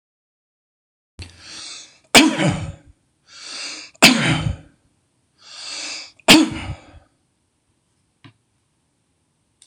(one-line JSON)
{"three_cough_length": "9.7 s", "three_cough_amplitude": 26028, "three_cough_signal_mean_std_ratio": 0.3, "survey_phase": "beta (2021-08-13 to 2022-03-07)", "age": "65+", "gender": "Male", "wearing_mask": "No", "symptom_none": true, "smoker_status": "Ex-smoker", "respiratory_condition_asthma": false, "respiratory_condition_other": false, "recruitment_source": "REACT", "submission_delay": "9 days", "covid_test_result": "Negative", "covid_test_method": "RT-qPCR"}